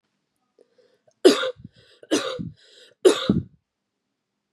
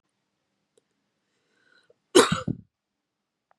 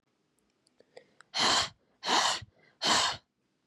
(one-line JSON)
{"three_cough_length": "4.5 s", "three_cough_amplitude": 28083, "three_cough_signal_mean_std_ratio": 0.29, "cough_length": "3.6 s", "cough_amplitude": 24683, "cough_signal_mean_std_ratio": 0.19, "exhalation_length": "3.7 s", "exhalation_amplitude": 7523, "exhalation_signal_mean_std_ratio": 0.44, "survey_phase": "beta (2021-08-13 to 2022-03-07)", "age": "18-44", "gender": "Female", "wearing_mask": "No", "symptom_none": true, "smoker_status": "Never smoked", "respiratory_condition_asthma": false, "respiratory_condition_other": false, "recruitment_source": "REACT", "submission_delay": "1 day", "covid_test_result": "Negative", "covid_test_method": "RT-qPCR", "influenza_a_test_result": "Negative", "influenza_b_test_result": "Negative"}